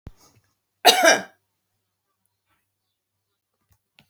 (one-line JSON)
{"cough_length": "4.1 s", "cough_amplitude": 32768, "cough_signal_mean_std_ratio": 0.22, "survey_phase": "alpha (2021-03-01 to 2021-08-12)", "age": "65+", "gender": "Female", "wearing_mask": "No", "symptom_none": true, "smoker_status": "Ex-smoker", "respiratory_condition_asthma": false, "respiratory_condition_other": false, "recruitment_source": "REACT", "submission_delay": "1 day", "covid_test_result": "Negative", "covid_test_method": "RT-qPCR"}